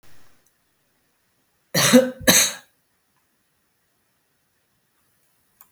{"cough_length": "5.7 s", "cough_amplitude": 32766, "cough_signal_mean_std_ratio": 0.25, "survey_phase": "beta (2021-08-13 to 2022-03-07)", "age": "65+", "gender": "Female", "wearing_mask": "No", "symptom_cough_any": true, "symptom_fatigue": true, "symptom_other": true, "smoker_status": "Never smoked", "respiratory_condition_asthma": false, "respiratory_condition_other": false, "recruitment_source": "Test and Trace", "submission_delay": "1 day", "covid_test_result": "Positive", "covid_test_method": "ePCR"}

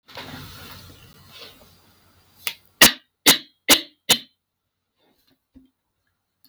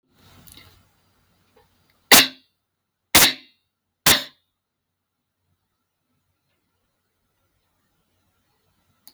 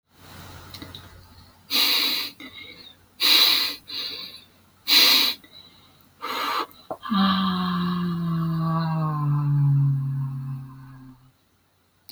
{"cough_length": "6.5 s", "cough_amplitude": 32768, "cough_signal_mean_std_ratio": 0.22, "three_cough_length": "9.1 s", "three_cough_amplitude": 32768, "three_cough_signal_mean_std_ratio": 0.18, "exhalation_length": "12.1 s", "exhalation_amplitude": 20336, "exhalation_signal_mean_std_ratio": 0.66, "survey_phase": "beta (2021-08-13 to 2022-03-07)", "age": "18-44", "gender": "Female", "wearing_mask": "No", "symptom_none": true, "smoker_status": "Never smoked", "respiratory_condition_asthma": false, "respiratory_condition_other": false, "recruitment_source": "REACT", "submission_delay": "2 days", "covid_test_result": "Negative", "covid_test_method": "RT-qPCR"}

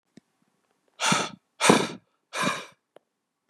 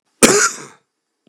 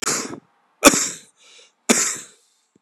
{"exhalation_length": "3.5 s", "exhalation_amplitude": 24554, "exhalation_signal_mean_std_ratio": 0.35, "cough_length": "1.3 s", "cough_amplitude": 32768, "cough_signal_mean_std_ratio": 0.38, "three_cough_length": "2.8 s", "three_cough_amplitude": 32768, "three_cough_signal_mean_std_ratio": 0.35, "survey_phase": "beta (2021-08-13 to 2022-03-07)", "age": "45-64", "gender": "Male", "wearing_mask": "No", "symptom_cough_any": true, "symptom_onset": "12 days", "smoker_status": "Ex-smoker", "respiratory_condition_asthma": false, "respiratory_condition_other": false, "recruitment_source": "REACT", "submission_delay": "1 day", "covid_test_result": "Negative", "covid_test_method": "RT-qPCR", "influenza_a_test_result": "Negative", "influenza_b_test_result": "Negative"}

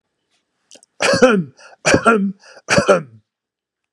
{"three_cough_length": "3.9 s", "three_cough_amplitude": 32768, "three_cough_signal_mean_std_ratio": 0.44, "survey_phase": "beta (2021-08-13 to 2022-03-07)", "age": "65+", "gender": "Male", "wearing_mask": "No", "symptom_none": true, "smoker_status": "Ex-smoker", "respiratory_condition_asthma": false, "respiratory_condition_other": false, "recruitment_source": "REACT", "submission_delay": "1 day", "covid_test_result": "Negative", "covid_test_method": "RT-qPCR", "influenza_a_test_result": "Negative", "influenza_b_test_result": "Negative"}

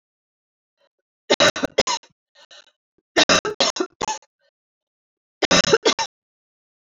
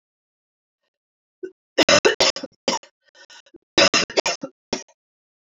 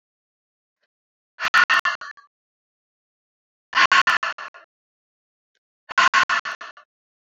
{"three_cough_length": "6.9 s", "three_cough_amplitude": 26878, "three_cough_signal_mean_std_ratio": 0.33, "cough_length": "5.5 s", "cough_amplitude": 29136, "cough_signal_mean_std_ratio": 0.31, "exhalation_length": "7.3 s", "exhalation_amplitude": 23561, "exhalation_signal_mean_std_ratio": 0.32, "survey_phase": "beta (2021-08-13 to 2022-03-07)", "age": "18-44", "gender": "Female", "wearing_mask": "No", "symptom_cough_any": true, "symptom_runny_or_blocked_nose": true, "symptom_sore_throat": true, "symptom_fatigue": true, "symptom_fever_high_temperature": true, "symptom_headache": true, "smoker_status": "Ex-smoker", "respiratory_condition_asthma": false, "respiratory_condition_other": false, "recruitment_source": "Test and Trace", "submission_delay": "1 day", "covid_test_result": "Positive", "covid_test_method": "RT-qPCR"}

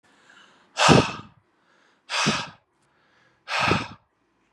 {"exhalation_length": "4.5 s", "exhalation_amplitude": 32173, "exhalation_signal_mean_std_ratio": 0.35, "survey_phase": "beta (2021-08-13 to 2022-03-07)", "age": "18-44", "gender": "Male", "wearing_mask": "No", "symptom_change_to_sense_of_smell_or_taste": true, "symptom_loss_of_taste": true, "symptom_onset": "2 days", "smoker_status": "Ex-smoker", "respiratory_condition_asthma": false, "respiratory_condition_other": false, "recruitment_source": "Test and Trace", "submission_delay": "2 days", "covid_test_result": "Positive", "covid_test_method": "ePCR"}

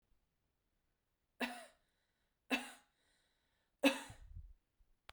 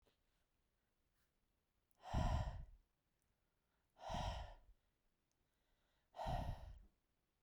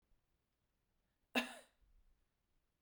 {"three_cough_length": "5.1 s", "three_cough_amplitude": 4037, "three_cough_signal_mean_std_ratio": 0.23, "exhalation_length": "7.4 s", "exhalation_amplitude": 1334, "exhalation_signal_mean_std_ratio": 0.37, "cough_length": "2.8 s", "cough_amplitude": 2927, "cough_signal_mean_std_ratio": 0.19, "survey_phase": "beta (2021-08-13 to 2022-03-07)", "age": "18-44", "gender": "Female", "wearing_mask": "No", "symptom_none": true, "smoker_status": "Never smoked", "respiratory_condition_asthma": false, "respiratory_condition_other": false, "recruitment_source": "REACT", "submission_delay": "3 days", "covid_test_result": "Negative", "covid_test_method": "RT-qPCR"}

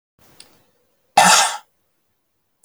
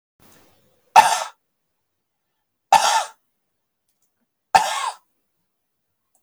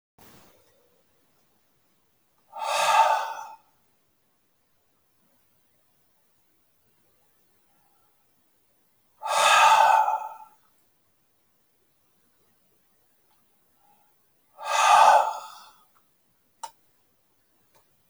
{"cough_length": "2.6 s", "cough_amplitude": 30480, "cough_signal_mean_std_ratio": 0.3, "three_cough_length": "6.2 s", "three_cough_amplitude": 31703, "three_cough_signal_mean_std_ratio": 0.26, "exhalation_length": "18.1 s", "exhalation_amplitude": 18972, "exhalation_signal_mean_std_ratio": 0.29, "survey_phase": "beta (2021-08-13 to 2022-03-07)", "age": "45-64", "gender": "Male", "wearing_mask": "No", "symptom_none": true, "smoker_status": "Ex-smoker", "respiratory_condition_asthma": true, "respiratory_condition_other": false, "recruitment_source": "REACT", "submission_delay": "1 day", "covid_test_result": "Negative", "covid_test_method": "RT-qPCR"}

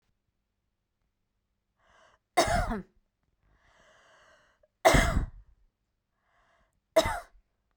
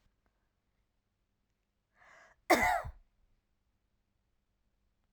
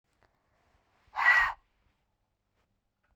{"three_cough_length": "7.8 s", "three_cough_amplitude": 16952, "three_cough_signal_mean_std_ratio": 0.27, "cough_length": "5.1 s", "cough_amplitude": 7871, "cough_signal_mean_std_ratio": 0.21, "exhalation_length": "3.2 s", "exhalation_amplitude": 8731, "exhalation_signal_mean_std_ratio": 0.27, "survey_phase": "beta (2021-08-13 to 2022-03-07)", "age": "45-64", "gender": "Female", "wearing_mask": "No", "symptom_fatigue": true, "smoker_status": "Never smoked", "respiratory_condition_asthma": false, "respiratory_condition_other": false, "recruitment_source": "REACT", "submission_delay": "2 days", "covid_test_result": "Negative", "covid_test_method": "RT-qPCR"}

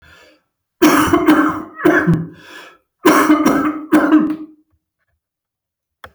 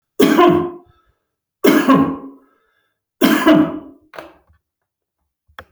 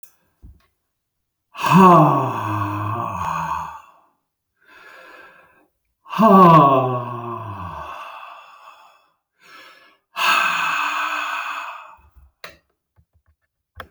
{"cough_length": "6.1 s", "cough_amplitude": 31533, "cough_signal_mean_std_ratio": 0.55, "three_cough_length": "5.7 s", "three_cough_amplitude": 30661, "three_cough_signal_mean_std_ratio": 0.43, "exhalation_length": "13.9 s", "exhalation_amplitude": 28791, "exhalation_signal_mean_std_ratio": 0.42, "survey_phase": "alpha (2021-03-01 to 2021-08-12)", "age": "65+", "gender": "Male", "wearing_mask": "No", "symptom_none": true, "smoker_status": "Never smoked", "respiratory_condition_asthma": false, "respiratory_condition_other": false, "recruitment_source": "REACT", "submission_delay": "6 days", "covid_test_result": "Negative", "covid_test_method": "RT-qPCR"}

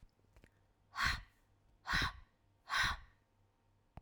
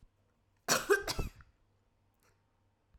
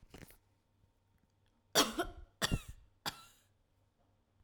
{"exhalation_length": "4.0 s", "exhalation_amplitude": 3082, "exhalation_signal_mean_std_ratio": 0.38, "cough_length": "3.0 s", "cough_amplitude": 5931, "cough_signal_mean_std_ratio": 0.3, "three_cough_length": "4.4 s", "three_cough_amplitude": 6458, "three_cough_signal_mean_std_ratio": 0.27, "survey_phase": "beta (2021-08-13 to 2022-03-07)", "age": "18-44", "gender": "Female", "wearing_mask": "No", "symptom_cough_any": true, "symptom_runny_or_blocked_nose": true, "symptom_fatigue": true, "symptom_headache": true, "symptom_onset": "2 days", "smoker_status": "Never smoked", "respiratory_condition_asthma": false, "respiratory_condition_other": false, "recruitment_source": "Test and Trace", "submission_delay": "1 day", "covid_test_result": "Positive", "covid_test_method": "RT-qPCR", "covid_ct_value": 22.6, "covid_ct_gene": "ORF1ab gene"}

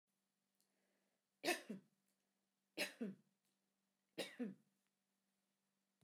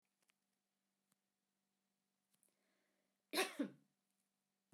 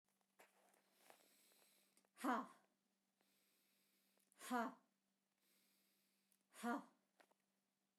{"three_cough_length": "6.0 s", "three_cough_amplitude": 1634, "three_cough_signal_mean_std_ratio": 0.27, "cough_length": "4.7 s", "cough_amplitude": 1888, "cough_signal_mean_std_ratio": 0.19, "exhalation_length": "8.0 s", "exhalation_amplitude": 1186, "exhalation_signal_mean_std_ratio": 0.25, "survey_phase": "beta (2021-08-13 to 2022-03-07)", "age": "45-64", "gender": "Female", "wearing_mask": "No", "symptom_none": true, "smoker_status": "Never smoked", "respiratory_condition_asthma": false, "respiratory_condition_other": false, "recruitment_source": "REACT", "submission_delay": "1 day", "covid_test_result": "Negative", "covid_test_method": "RT-qPCR"}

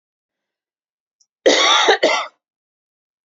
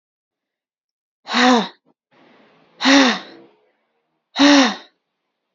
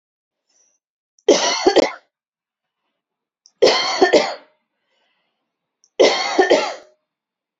{"cough_length": "3.2 s", "cough_amplitude": 29048, "cough_signal_mean_std_ratio": 0.39, "exhalation_length": "5.5 s", "exhalation_amplitude": 31924, "exhalation_signal_mean_std_ratio": 0.36, "three_cough_length": "7.6 s", "three_cough_amplitude": 30241, "three_cough_signal_mean_std_ratio": 0.37, "survey_phase": "alpha (2021-03-01 to 2021-08-12)", "age": "18-44", "gender": "Female", "wearing_mask": "No", "symptom_none": true, "smoker_status": "Never smoked", "respiratory_condition_asthma": false, "respiratory_condition_other": false, "recruitment_source": "REACT", "submission_delay": "1 day", "covid_test_result": "Negative", "covid_test_method": "RT-qPCR"}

